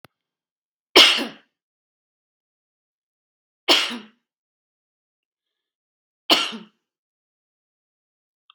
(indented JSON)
{
  "three_cough_length": "8.5 s",
  "three_cough_amplitude": 32768,
  "three_cough_signal_mean_std_ratio": 0.2,
  "survey_phase": "beta (2021-08-13 to 2022-03-07)",
  "age": "45-64",
  "gender": "Female",
  "wearing_mask": "No",
  "symptom_runny_or_blocked_nose": true,
  "smoker_status": "Never smoked",
  "respiratory_condition_asthma": false,
  "respiratory_condition_other": false,
  "recruitment_source": "REACT",
  "submission_delay": "1 day",
  "covid_test_result": "Negative",
  "covid_test_method": "RT-qPCR",
  "influenza_a_test_result": "Negative",
  "influenza_b_test_result": "Negative"
}